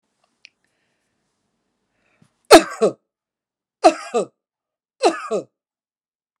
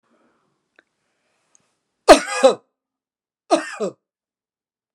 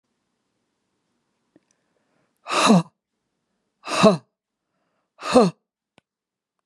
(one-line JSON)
{"three_cough_length": "6.4 s", "three_cough_amplitude": 32768, "three_cough_signal_mean_std_ratio": 0.22, "cough_length": "4.9 s", "cough_amplitude": 32768, "cough_signal_mean_std_ratio": 0.22, "exhalation_length": "6.7 s", "exhalation_amplitude": 28258, "exhalation_signal_mean_std_ratio": 0.27, "survey_phase": "beta (2021-08-13 to 2022-03-07)", "age": "45-64", "gender": "Female", "wearing_mask": "No", "symptom_none": true, "smoker_status": "Ex-smoker", "respiratory_condition_asthma": false, "respiratory_condition_other": false, "recruitment_source": "REACT", "submission_delay": "1 day", "covid_test_result": "Negative", "covid_test_method": "RT-qPCR"}